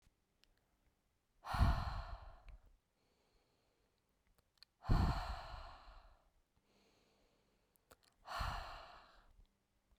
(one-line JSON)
{"exhalation_length": "10.0 s", "exhalation_amplitude": 2819, "exhalation_signal_mean_std_ratio": 0.32, "survey_phase": "beta (2021-08-13 to 2022-03-07)", "age": "18-44", "gender": "Female", "wearing_mask": "No", "symptom_fatigue": true, "symptom_headache": true, "symptom_change_to_sense_of_smell_or_taste": true, "smoker_status": "Never smoked", "respiratory_condition_asthma": false, "respiratory_condition_other": false, "recruitment_source": "Test and Trace", "submission_delay": "1 day", "covid_test_result": "Positive", "covid_test_method": "RT-qPCR", "covid_ct_value": 16.0, "covid_ct_gene": "ORF1ab gene", "covid_ct_mean": 16.7, "covid_viral_load": "3300000 copies/ml", "covid_viral_load_category": "High viral load (>1M copies/ml)"}